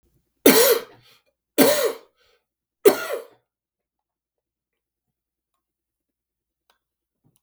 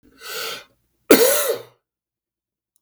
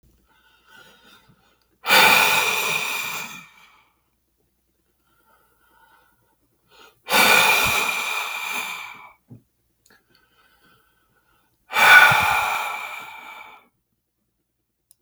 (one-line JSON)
{"three_cough_length": "7.4 s", "three_cough_amplitude": 32768, "three_cough_signal_mean_std_ratio": 0.26, "cough_length": "2.8 s", "cough_amplitude": 32768, "cough_signal_mean_std_ratio": 0.34, "exhalation_length": "15.0 s", "exhalation_amplitude": 32768, "exhalation_signal_mean_std_ratio": 0.38, "survey_phase": "beta (2021-08-13 to 2022-03-07)", "age": "65+", "gender": "Male", "wearing_mask": "No", "symptom_none": true, "smoker_status": "Never smoked", "respiratory_condition_asthma": false, "respiratory_condition_other": false, "recruitment_source": "REACT", "submission_delay": "2 days", "covid_test_result": "Negative", "covid_test_method": "RT-qPCR", "influenza_a_test_result": "Negative", "influenza_b_test_result": "Negative"}